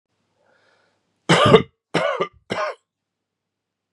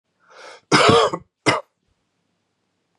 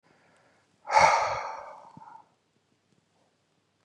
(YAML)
three_cough_length: 3.9 s
three_cough_amplitude: 32767
three_cough_signal_mean_std_ratio: 0.32
cough_length: 3.0 s
cough_amplitude: 31551
cough_signal_mean_std_ratio: 0.35
exhalation_length: 3.8 s
exhalation_amplitude: 16987
exhalation_signal_mean_std_ratio: 0.31
survey_phase: beta (2021-08-13 to 2022-03-07)
age: 45-64
gender: Male
wearing_mask: 'No'
symptom_none: true
smoker_status: Ex-smoker
respiratory_condition_asthma: false
respiratory_condition_other: false
recruitment_source: REACT
submission_delay: 2 days
covid_test_result: Negative
covid_test_method: RT-qPCR
influenza_a_test_result: Negative
influenza_b_test_result: Negative